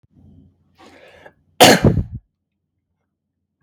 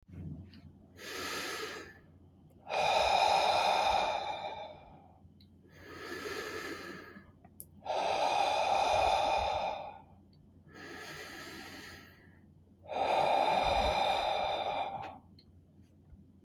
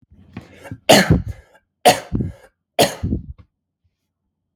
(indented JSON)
{
  "cough_length": "3.6 s",
  "cough_amplitude": 32768,
  "cough_signal_mean_std_ratio": 0.26,
  "exhalation_length": "16.4 s",
  "exhalation_amplitude": 5037,
  "exhalation_signal_mean_std_ratio": 0.64,
  "three_cough_length": "4.6 s",
  "three_cough_amplitude": 32768,
  "three_cough_signal_mean_std_ratio": 0.34,
  "survey_phase": "beta (2021-08-13 to 2022-03-07)",
  "age": "18-44",
  "gender": "Male",
  "wearing_mask": "No",
  "symptom_none": true,
  "symptom_onset": "7 days",
  "smoker_status": "Never smoked",
  "respiratory_condition_asthma": false,
  "respiratory_condition_other": false,
  "recruitment_source": "REACT",
  "submission_delay": "3 days",
  "covid_test_result": "Negative",
  "covid_test_method": "RT-qPCR",
  "influenza_a_test_result": "Negative",
  "influenza_b_test_result": "Negative"
}